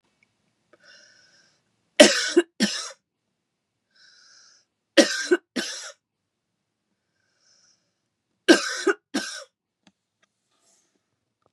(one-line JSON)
{"three_cough_length": "11.5 s", "three_cough_amplitude": 32768, "three_cough_signal_mean_std_ratio": 0.23, "survey_phase": "beta (2021-08-13 to 2022-03-07)", "age": "45-64", "gender": "Female", "wearing_mask": "No", "symptom_runny_or_blocked_nose": true, "symptom_fatigue": true, "symptom_other": true, "symptom_onset": "3 days", "smoker_status": "Ex-smoker", "respiratory_condition_asthma": false, "respiratory_condition_other": false, "recruitment_source": "Test and Trace", "submission_delay": "2 days", "covid_test_result": "Positive", "covid_test_method": "RT-qPCR", "covid_ct_value": 21.3, "covid_ct_gene": "N gene", "covid_ct_mean": 21.6, "covid_viral_load": "80000 copies/ml", "covid_viral_load_category": "Low viral load (10K-1M copies/ml)"}